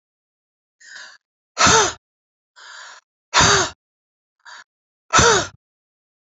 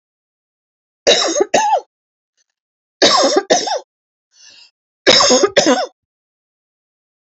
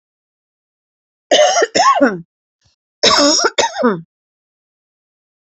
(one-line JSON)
{"exhalation_length": "6.4 s", "exhalation_amplitude": 32768, "exhalation_signal_mean_std_ratio": 0.33, "three_cough_length": "7.3 s", "three_cough_amplitude": 32767, "three_cough_signal_mean_std_ratio": 0.43, "cough_length": "5.5 s", "cough_amplitude": 31364, "cough_signal_mean_std_ratio": 0.45, "survey_phase": "beta (2021-08-13 to 2022-03-07)", "age": "45-64", "gender": "Female", "wearing_mask": "No", "symptom_runny_or_blocked_nose": true, "symptom_headache": true, "symptom_onset": "5 days", "smoker_status": "Ex-smoker", "respiratory_condition_asthma": false, "respiratory_condition_other": false, "recruitment_source": "REACT", "submission_delay": "2 days", "covid_test_result": "Negative", "covid_test_method": "RT-qPCR", "influenza_a_test_result": "Negative", "influenza_b_test_result": "Negative"}